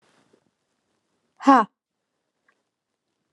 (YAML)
exhalation_length: 3.3 s
exhalation_amplitude: 26860
exhalation_signal_mean_std_ratio: 0.18
survey_phase: alpha (2021-03-01 to 2021-08-12)
age: 18-44
gender: Female
wearing_mask: 'No'
symptom_diarrhoea: true
symptom_fatigue: true
symptom_headache: true
symptom_onset: 3 days
smoker_status: Current smoker (e-cigarettes or vapes only)
respiratory_condition_asthma: true
respiratory_condition_other: false
recruitment_source: REACT
submission_delay: 1 day
covid_test_result: Negative
covid_test_method: RT-qPCR